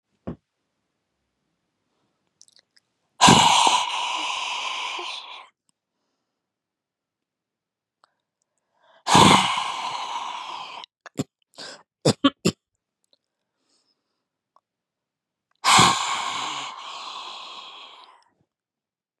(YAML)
exhalation_length: 19.2 s
exhalation_amplitude: 31812
exhalation_signal_mean_std_ratio: 0.33
survey_phase: beta (2021-08-13 to 2022-03-07)
age: 45-64
gender: Female
wearing_mask: 'No'
symptom_cough_any: true
symptom_onset: 4 days
smoker_status: Never smoked
respiratory_condition_asthma: false
respiratory_condition_other: false
recruitment_source: Test and Trace
submission_delay: 1 day
covid_test_result: Positive
covid_test_method: ePCR